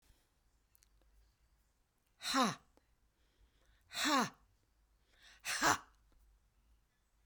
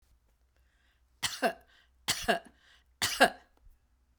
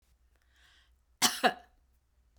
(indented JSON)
{
  "exhalation_length": "7.3 s",
  "exhalation_amplitude": 4676,
  "exhalation_signal_mean_std_ratio": 0.3,
  "three_cough_length": "4.2 s",
  "three_cough_amplitude": 12306,
  "three_cough_signal_mean_std_ratio": 0.3,
  "cough_length": "2.4 s",
  "cough_amplitude": 10633,
  "cough_signal_mean_std_ratio": 0.24,
  "survey_phase": "beta (2021-08-13 to 2022-03-07)",
  "age": "65+",
  "gender": "Female",
  "wearing_mask": "No",
  "symptom_cough_any": true,
  "symptom_fatigue": true,
  "symptom_onset": "4 days",
  "smoker_status": "Never smoked",
  "respiratory_condition_asthma": false,
  "respiratory_condition_other": false,
  "recruitment_source": "REACT",
  "submission_delay": "2 days",
  "covid_test_result": "Negative",
  "covid_test_method": "RT-qPCR"
}